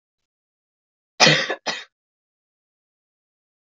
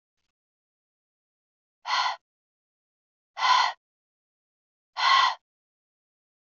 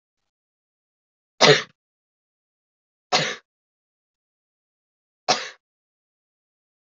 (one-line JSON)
{"cough_length": "3.8 s", "cough_amplitude": 32768, "cough_signal_mean_std_ratio": 0.23, "exhalation_length": "6.6 s", "exhalation_amplitude": 12100, "exhalation_signal_mean_std_ratio": 0.3, "three_cough_length": "7.0 s", "three_cough_amplitude": 32576, "three_cough_signal_mean_std_ratio": 0.19, "survey_phase": "alpha (2021-03-01 to 2021-08-12)", "age": "18-44", "gender": "Female", "wearing_mask": "No", "symptom_cough_any": true, "symptom_fatigue": true, "symptom_change_to_sense_of_smell_or_taste": true, "smoker_status": "Never smoked", "respiratory_condition_asthma": false, "respiratory_condition_other": false, "recruitment_source": "Test and Trace", "submission_delay": "2 days", "covid_test_result": "Positive", "covid_test_method": "RT-qPCR", "covid_ct_value": 17.3, "covid_ct_gene": "ORF1ab gene", "covid_ct_mean": 18.2, "covid_viral_load": "1000000 copies/ml", "covid_viral_load_category": "High viral load (>1M copies/ml)"}